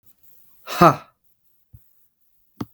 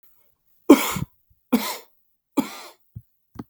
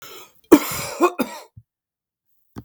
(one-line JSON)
{"exhalation_length": "2.7 s", "exhalation_amplitude": 32768, "exhalation_signal_mean_std_ratio": 0.21, "three_cough_length": "3.5 s", "three_cough_amplitude": 32768, "three_cough_signal_mean_std_ratio": 0.25, "cough_length": "2.6 s", "cough_amplitude": 32768, "cough_signal_mean_std_ratio": 0.29, "survey_phase": "beta (2021-08-13 to 2022-03-07)", "age": "45-64", "gender": "Male", "wearing_mask": "No", "symptom_fatigue": true, "symptom_other": true, "smoker_status": "Ex-smoker", "respiratory_condition_asthma": true, "respiratory_condition_other": false, "recruitment_source": "REACT", "submission_delay": "1 day", "covid_test_result": "Negative", "covid_test_method": "RT-qPCR"}